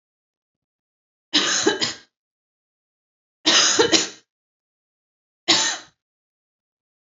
{"three_cough_length": "7.2 s", "three_cough_amplitude": 26612, "three_cough_signal_mean_std_ratio": 0.34, "survey_phase": "beta (2021-08-13 to 2022-03-07)", "age": "18-44", "gender": "Female", "wearing_mask": "No", "symptom_none": true, "smoker_status": "Never smoked", "respiratory_condition_asthma": false, "respiratory_condition_other": false, "recruitment_source": "Test and Trace", "submission_delay": "0 days", "covid_test_result": "Positive", "covid_test_method": "LFT"}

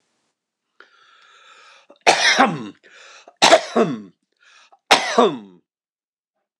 {"three_cough_length": "6.6 s", "three_cough_amplitude": 26028, "three_cough_signal_mean_std_ratio": 0.34, "survey_phase": "alpha (2021-03-01 to 2021-08-12)", "age": "65+", "gender": "Male", "wearing_mask": "No", "symptom_none": true, "smoker_status": "Never smoked", "respiratory_condition_asthma": false, "respiratory_condition_other": false, "recruitment_source": "REACT", "submission_delay": "1 day", "covid_test_result": "Negative", "covid_test_method": "RT-qPCR"}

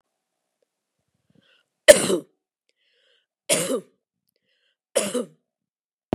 {"cough_length": "6.1 s", "cough_amplitude": 32768, "cough_signal_mean_std_ratio": 0.21, "survey_phase": "beta (2021-08-13 to 2022-03-07)", "age": "45-64", "gender": "Female", "wearing_mask": "No", "symptom_cough_any": true, "symptom_onset": "13 days", "smoker_status": "Never smoked", "respiratory_condition_asthma": false, "respiratory_condition_other": false, "recruitment_source": "REACT", "submission_delay": "0 days", "covid_test_result": "Negative", "covid_test_method": "RT-qPCR", "influenza_a_test_result": "Negative", "influenza_b_test_result": "Negative"}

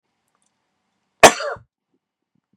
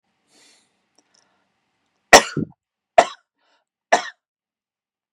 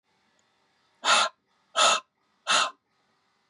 {"cough_length": "2.6 s", "cough_amplitude": 32768, "cough_signal_mean_std_ratio": 0.17, "three_cough_length": "5.1 s", "three_cough_amplitude": 32768, "three_cough_signal_mean_std_ratio": 0.17, "exhalation_length": "3.5 s", "exhalation_amplitude": 14726, "exhalation_signal_mean_std_ratio": 0.36, "survey_phase": "beta (2021-08-13 to 2022-03-07)", "age": "45-64", "gender": "Male", "wearing_mask": "No", "symptom_none": true, "smoker_status": "Never smoked", "respiratory_condition_asthma": false, "respiratory_condition_other": false, "recruitment_source": "REACT", "submission_delay": "1 day", "covid_test_result": "Negative", "covid_test_method": "RT-qPCR", "influenza_a_test_result": "Negative", "influenza_b_test_result": "Negative"}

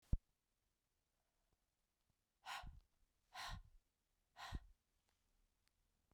{"exhalation_length": "6.1 s", "exhalation_amplitude": 2001, "exhalation_signal_mean_std_ratio": 0.23, "survey_phase": "beta (2021-08-13 to 2022-03-07)", "age": "45-64", "gender": "Female", "wearing_mask": "No", "symptom_cough_any": true, "symptom_runny_or_blocked_nose": true, "symptom_sore_throat": true, "symptom_fatigue": true, "symptom_headache": true, "symptom_change_to_sense_of_smell_or_taste": true, "smoker_status": "Never smoked", "respiratory_condition_asthma": false, "respiratory_condition_other": false, "recruitment_source": "Test and Trace", "submission_delay": "2 days", "covid_test_result": "Positive", "covid_test_method": "RT-qPCR", "covid_ct_value": 33.1, "covid_ct_gene": "N gene"}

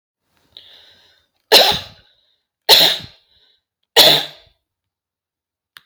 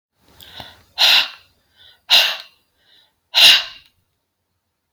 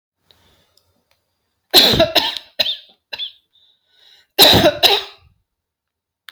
{"three_cough_length": "5.9 s", "three_cough_amplitude": 32768, "three_cough_signal_mean_std_ratio": 0.3, "exhalation_length": "4.9 s", "exhalation_amplitude": 32768, "exhalation_signal_mean_std_ratio": 0.33, "cough_length": "6.3 s", "cough_amplitude": 32768, "cough_signal_mean_std_ratio": 0.35, "survey_phase": "alpha (2021-03-01 to 2021-08-12)", "age": "45-64", "gender": "Female", "wearing_mask": "No", "symptom_none": true, "smoker_status": "Never smoked", "respiratory_condition_asthma": false, "respiratory_condition_other": false, "recruitment_source": "REACT", "submission_delay": "8 days", "covid_test_result": "Negative", "covid_test_method": "RT-qPCR"}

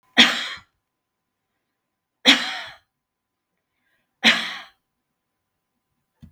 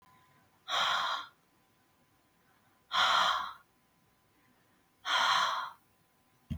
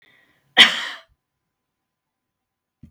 {"three_cough_length": "6.3 s", "three_cough_amplitude": 32768, "three_cough_signal_mean_std_ratio": 0.25, "exhalation_length": "6.6 s", "exhalation_amplitude": 5622, "exhalation_signal_mean_std_ratio": 0.44, "cough_length": "2.9 s", "cough_amplitude": 32768, "cough_signal_mean_std_ratio": 0.2, "survey_phase": "beta (2021-08-13 to 2022-03-07)", "age": "65+", "gender": "Female", "wearing_mask": "No", "symptom_none": true, "smoker_status": "Never smoked", "respiratory_condition_asthma": false, "respiratory_condition_other": false, "recruitment_source": "REACT", "submission_delay": "3 days", "covid_test_result": "Negative", "covid_test_method": "RT-qPCR", "influenza_a_test_result": "Negative", "influenza_b_test_result": "Negative"}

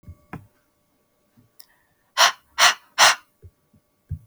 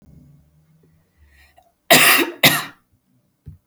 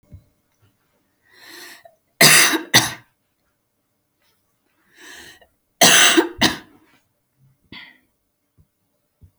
{"exhalation_length": "4.3 s", "exhalation_amplitude": 32736, "exhalation_signal_mean_std_ratio": 0.27, "cough_length": "3.7 s", "cough_amplitude": 32768, "cough_signal_mean_std_ratio": 0.32, "three_cough_length": "9.4 s", "three_cough_amplitude": 32768, "three_cough_signal_mean_std_ratio": 0.28, "survey_phase": "beta (2021-08-13 to 2022-03-07)", "age": "18-44", "gender": "Female", "wearing_mask": "No", "symptom_none": true, "smoker_status": "Never smoked", "respiratory_condition_asthma": false, "respiratory_condition_other": false, "recruitment_source": "REACT", "submission_delay": "1 day", "covid_test_result": "Negative", "covid_test_method": "RT-qPCR", "influenza_a_test_result": "Negative", "influenza_b_test_result": "Negative"}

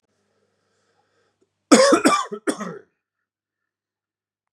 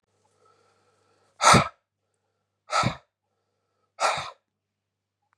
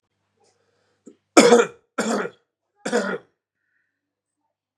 {"cough_length": "4.5 s", "cough_amplitude": 32428, "cough_signal_mean_std_ratio": 0.29, "exhalation_length": "5.4 s", "exhalation_amplitude": 24597, "exhalation_signal_mean_std_ratio": 0.25, "three_cough_length": "4.8 s", "three_cough_amplitude": 32767, "three_cough_signal_mean_std_ratio": 0.28, "survey_phase": "beta (2021-08-13 to 2022-03-07)", "age": "18-44", "gender": "Male", "wearing_mask": "No", "symptom_fatigue": true, "symptom_onset": "2 days", "smoker_status": "Prefer not to say", "respiratory_condition_asthma": false, "respiratory_condition_other": false, "recruitment_source": "Test and Trace", "submission_delay": "1 day", "covid_test_result": "Positive", "covid_test_method": "RT-qPCR", "covid_ct_value": 17.0, "covid_ct_gene": "ORF1ab gene", "covid_ct_mean": 17.7, "covid_viral_load": "1600000 copies/ml", "covid_viral_load_category": "High viral load (>1M copies/ml)"}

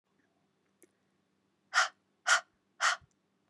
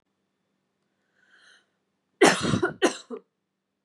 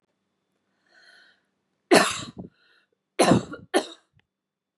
{"exhalation_length": "3.5 s", "exhalation_amplitude": 7790, "exhalation_signal_mean_std_ratio": 0.27, "cough_length": "3.8 s", "cough_amplitude": 22235, "cough_signal_mean_std_ratio": 0.28, "three_cough_length": "4.8 s", "three_cough_amplitude": 30290, "three_cough_signal_mean_std_ratio": 0.27, "survey_phase": "beta (2021-08-13 to 2022-03-07)", "age": "18-44", "gender": "Female", "wearing_mask": "No", "symptom_none": true, "smoker_status": "Never smoked", "respiratory_condition_asthma": false, "respiratory_condition_other": false, "recruitment_source": "REACT", "submission_delay": "5 days", "covid_test_result": "Negative", "covid_test_method": "RT-qPCR", "influenza_a_test_result": "Negative", "influenza_b_test_result": "Negative"}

